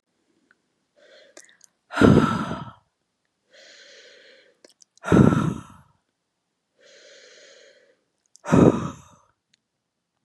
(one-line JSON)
{"exhalation_length": "10.2 s", "exhalation_amplitude": 30256, "exhalation_signal_mean_std_ratio": 0.27, "survey_phase": "beta (2021-08-13 to 2022-03-07)", "age": "45-64", "gender": "Female", "wearing_mask": "No", "symptom_cough_any": true, "symptom_runny_or_blocked_nose": true, "symptom_sore_throat": true, "symptom_fever_high_temperature": true, "symptom_headache": true, "smoker_status": "Never smoked", "respiratory_condition_asthma": false, "respiratory_condition_other": false, "recruitment_source": "Test and Trace", "submission_delay": "-1 day", "covid_test_result": "Positive", "covid_test_method": "LFT"}